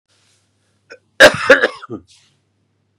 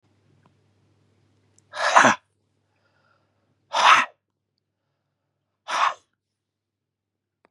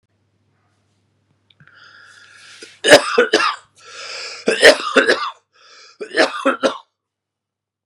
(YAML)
cough_length: 3.0 s
cough_amplitude: 32768
cough_signal_mean_std_ratio: 0.27
exhalation_length: 7.5 s
exhalation_amplitude: 30263
exhalation_signal_mean_std_ratio: 0.25
three_cough_length: 7.9 s
three_cough_amplitude: 32768
three_cough_signal_mean_std_ratio: 0.35
survey_phase: beta (2021-08-13 to 2022-03-07)
age: 45-64
gender: Male
wearing_mask: 'No'
symptom_cough_any: true
symptom_shortness_of_breath: true
symptom_fatigue: true
symptom_onset: 2 days
smoker_status: Never smoked
respiratory_condition_asthma: true
respiratory_condition_other: false
recruitment_source: Test and Trace
submission_delay: 1 day
covid_test_method: RT-qPCR
covid_ct_value: 34.1
covid_ct_gene: N gene
covid_ct_mean: 34.1
covid_viral_load: 6.6 copies/ml
covid_viral_load_category: Minimal viral load (< 10K copies/ml)